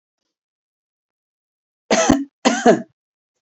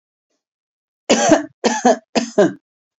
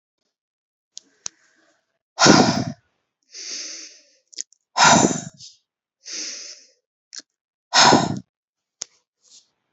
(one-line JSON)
{"cough_length": "3.4 s", "cough_amplitude": 29176, "cough_signal_mean_std_ratio": 0.32, "three_cough_length": "3.0 s", "three_cough_amplitude": 31802, "three_cough_signal_mean_std_ratio": 0.42, "exhalation_length": "9.7 s", "exhalation_amplitude": 31700, "exhalation_signal_mean_std_ratio": 0.31, "survey_phase": "beta (2021-08-13 to 2022-03-07)", "age": "45-64", "gender": "Female", "wearing_mask": "No", "symptom_none": true, "smoker_status": "Ex-smoker", "respiratory_condition_asthma": false, "respiratory_condition_other": false, "recruitment_source": "REACT", "submission_delay": "2 days", "covid_test_result": "Negative", "covid_test_method": "RT-qPCR", "influenza_a_test_result": "Negative", "influenza_b_test_result": "Negative"}